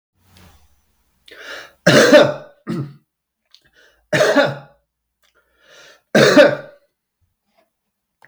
{"three_cough_length": "8.3 s", "three_cough_amplitude": 32768, "three_cough_signal_mean_std_ratio": 0.33, "survey_phase": "beta (2021-08-13 to 2022-03-07)", "age": "45-64", "gender": "Male", "wearing_mask": "No", "symptom_fatigue": true, "symptom_other": true, "symptom_onset": "4 days", "smoker_status": "Never smoked", "respiratory_condition_asthma": false, "respiratory_condition_other": false, "recruitment_source": "Test and Trace", "submission_delay": "1 day", "covid_test_result": "Positive", "covid_test_method": "RT-qPCR", "covid_ct_value": 15.7, "covid_ct_gene": "ORF1ab gene", "covid_ct_mean": 16.8, "covid_viral_load": "3200000 copies/ml", "covid_viral_load_category": "High viral load (>1M copies/ml)"}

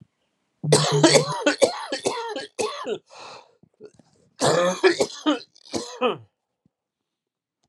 {"cough_length": "7.7 s", "cough_amplitude": 30217, "cough_signal_mean_std_ratio": 0.46, "survey_phase": "alpha (2021-03-01 to 2021-08-12)", "age": "45-64", "gender": "Male", "wearing_mask": "No", "symptom_cough_any": true, "symptom_new_continuous_cough": true, "symptom_shortness_of_breath": true, "symptom_fatigue": true, "symptom_fever_high_temperature": true, "symptom_onset": "4 days", "smoker_status": "Ex-smoker", "respiratory_condition_asthma": false, "respiratory_condition_other": false, "recruitment_source": "Test and Trace", "submission_delay": "1 day", "covid_ct_value": 28.0, "covid_ct_gene": "ORF1ab gene"}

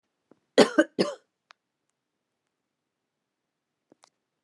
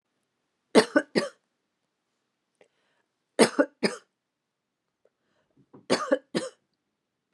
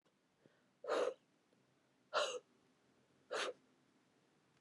{"cough_length": "4.4 s", "cough_amplitude": 25845, "cough_signal_mean_std_ratio": 0.17, "three_cough_length": "7.3 s", "three_cough_amplitude": 25827, "three_cough_signal_mean_std_ratio": 0.23, "exhalation_length": "4.6 s", "exhalation_amplitude": 1932, "exhalation_signal_mean_std_ratio": 0.34, "survey_phase": "beta (2021-08-13 to 2022-03-07)", "age": "18-44", "gender": "Female", "wearing_mask": "No", "symptom_cough_any": true, "symptom_runny_or_blocked_nose": true, "symptom_fatigue": true, "symptom_onset": "4 days", "smoker_status": "Never smoked", "respiratory_condition_asthma": true, "respiratory_condition_other": false, "recruitment_source": "REACT", "submission_delay": "2 days", "covid_test_result": "Negative", "covid_test_method": "RT-qPCR"}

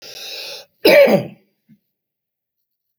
{"cough_length": "3.0 s", "cough_amplitude": 30336, "cough_signal_mean_std_ratio": 0.33, "survey_phase": "alpha (2021-03-01 to 2021-08-12)", "age": "65+", "gender": "Male", "wearing_mask": "No", "symptom_cough_any": true, "smoker_status": "Never smoked", "respiratory_condition_asthma": false, "respiratory_condition_other": true, "recruitment_source": "REACT", "submission_delay": "3 days", "covid_test_result": "Negative", "covid_test_method": "RT-qPCR"}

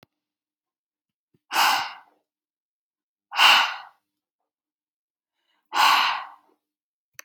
{"exhalation_length": "7.2 s", "exhalation_amplitude": 23249, "exhalation_signal_mean_std_ratio": 0.31, "survey_phase": "alpha (2021-03-01 to 2021-08-12)", "age": "18-44", "gender": "Female", "wearing_mask": "No", "symptom_none": true, "smoker_status": "Ex-smoker", "respiratory_condition_asthma": true, "respiratory_condition_other": false, "recruitment_source": "REACT", "submission_delay": "1 day", "covid_test_result": "Negative", "covid_test_method": "RT-qPCR"}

